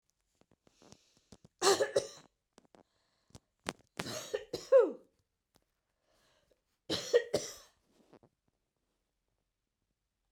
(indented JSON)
{
  "three_cough_length": "10.3 s",
  "three_cough_amplitude": 7116,
  "three_cough_signal_mean_std_ratio": 0.24,
  "survey_phase": "beta (2021-08-13 to 2022-03-07)",
  "age": "45-64",
  "gender": "Female",
  "wearing_mask": "No",
  "symptom_headache": true,
  "symptom_onset": "4 days",
  "smoker_status": "Never smoked",
  "respiratory_condition_asthma": false,
  "respiratory_condition_other": false,
  "recruitment_source": "REACT",
  "submission_delay": "3 days",
  "covid_test_result": "Negative",
  "covid_test_method": "RT-qPCR",
  "influenza_a_test_result": "Negative",
  "influenza_b_test_result": "Negative"
}